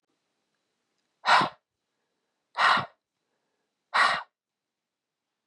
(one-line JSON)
{"exhalation_length": "5.5 s", "exhalation_amplitude": 13640, "exhalation_signal_mean_std_ratio": 0.29, "survey_phase": "beta (2021-08-13 to 2022-03-07)", "age": "18-44", "gender": "Male", "wearing_mask": "No", "symptom_cough_any": true, "symptom_runny_or_blocked_nose": true, "symptom_sore_throat": true, "symptom_onset": "5 days", "smoker_status": "Never smoked", "respiratory_condition_asthma": false, "respiratory_condition_other": false, "recruitment_source": "REACT", "submission_delay": "1 day", "covid_test_result": "Negative", "covid_test_method": "RT-qPCR", "influenza_a_test_result": "Negative", "influenza_b_test_result": "Negative"}